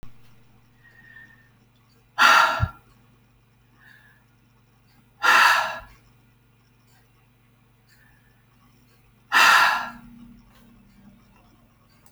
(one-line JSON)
{"exhalation_length": "12.1 s", "exhalation_amplitude": 25242, "exhalation_signal_mean_std_ratio": 0.3, "survey_phase": "alpha (2021-03-01 to 2021-08-12)", "age": "18-44", "gender": "Female", "wearing_mask": "No", "symptom_none": true, "smoker_status": "Never smoked", "respiratory_condition_asthma": false, "respiratory_condition_other": false, "recruitment_source": "REACT", "submission_delay": "4 days", "covid_test_result": "Negative", "covid_test_method": "RT-qPCR"}